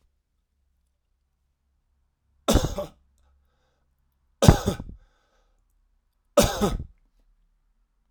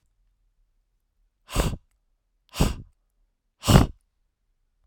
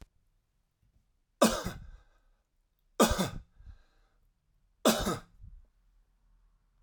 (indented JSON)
{
  "cough_length": "8.1 s",
  "cough_amplitude": 32768,
  "cough_signal_mean_std_ratio": 0.23,
  "exhalation_length": "4.9 s",
  "exhalation_amplitude": 32768,
  "exhalation_signal_mean_std_ratio": 0.24,
  "three_cough_length": "6.8 s",
  "three_cough_amplitude": 13133,
  "three_cough_signal_mean_std_ratio": 0.28,
  "survey_phase": "alpha (2021-03-01 to 2021-08-12)",
  "age": "45-64",
  "gender": "Male",
  "wearing_mask": "No",
  "symptom_none": true,
  "smoker_status": "Ex-smoker",
  "respiratory_condition_asthma": false,
  "respiratory_condition_other": false,
  "recruitment_source": "REACT",
  "submission_delay": "2 days",
  "covid_test_result": "Negative",
  "covid_test_method": "RT-qPCR"
}